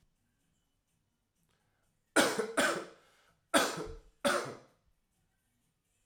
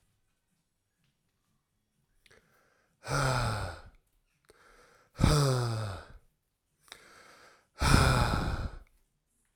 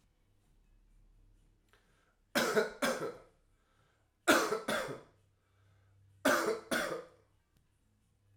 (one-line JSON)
{"cough_length": "6.1 s", "cough_amplitude": 8714, "cough_signal_mean_std_ratio": 0.33, "exhalation_length": "9.6 s", "exhalation_amplitude": 14674, "exhalation_signal_mean_std_ratio": 0.4, "three_cough_length": "8.4 s", "three_cough_amplitude": 7214, "three_cough_signal_mean_std_ratio": 0.37, "survey_phase": "alpha (2021-03-01 to 2021-08-12)", "age": "18-44", "gender": "Male", "wearing_mask": "No", "symptom_cough_any": true, "symptom_fatigue": true, "symptom_fever_high_temperature": true, "symptom_headache": true, "symptom_change_to_sense_of_smell_or_taste": true, "symptom_loss_of_taste": true, "symptom_onset": "2 days", "smoker_status": "Never smoked", "respiratory_condition_asthma": false, "respiratory_condition_other": false, "recruitment_source": "Test and Trace", "submission_delay": "2 days", "covid_test_result": "Positive", "covid_test_method": "RT-qPCR", "covid_ct_value": 15.4, "covid_ct_gene": "ORF1ab gene", "covid_ct_mean": 16.0, "covid_viral_load": "5500000 copies/ml", "covid_viral_load_category": "High viral load (>1M copies/ml)"}